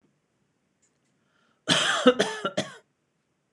cough_length: 3.5 s
cough_amplitude: 22856
cough_signal_mean_std_ratio: 0.33
survey_phase: beta (2021-08-13 to 2022-03-07)
age: 45-64
gender: Female
wearing_mask: 'No'
symptom_none: true
smoker_status: Never smoked
respiratory_condition_asthma: false
respiratory_condition_other: false
recruitment_source: REACT
submission_delay: 1 day
covid_test_result: Negative
covid_test_method: RT-qPCR
influenza_a_test_result: Negative
influenza_b_test_result: Negative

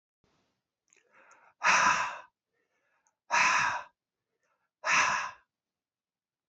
exhalation_length: 6.5 s
exhalation_amplitude: 8354
exhalation_signal_mean_std_ratio: 0.38
survey_phase: beta (2021-08-13 to 2022-03-07)
age: 45-64
gender: Male
wearing_mask: 'No'
symptom_cough_any: true
symptom_shortness_of_breath: true
symptom_headache: true
symptom_onset: 12 days
smoker_status: Never smoked
respiratory_condition_asthma: false
respiratory_condition_other: false
recruitment_source: REACT
submission_delay: 1 day
covid_test_result: Negative
covid_test_method: RT-qPCR
influenza_a_test_result: Negative
influenza_b_test_result: Negative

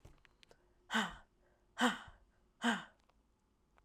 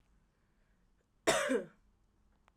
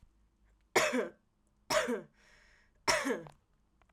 exhalation_length: 3.8 s
exhalation_amplitude: 4242
exhalation_signal_mean_std_ratio: 0.32
cough_length: 2.6 s
cough_amplitude: 5481
cough_signal_mean_std_ratio: 0.31
three_cough_length: 3.9 s
three_cough_amplitude: 7907
three_cough_signal_mean_std_ratio: 0.4
survey_phase: alpha (2021-03-01 to 2021-08-12)
age: 18-44
gender: Female
wearing_mask: 'No'
symptom_none: true
smoker_status: Never smoked
respiratory_condition_asthma: false
respiratory_condition_other: false
recruitment_source: Test and Trace
submission_delay: 1 day
covid_test_result: Positive
covid_test_method: RT-qPCR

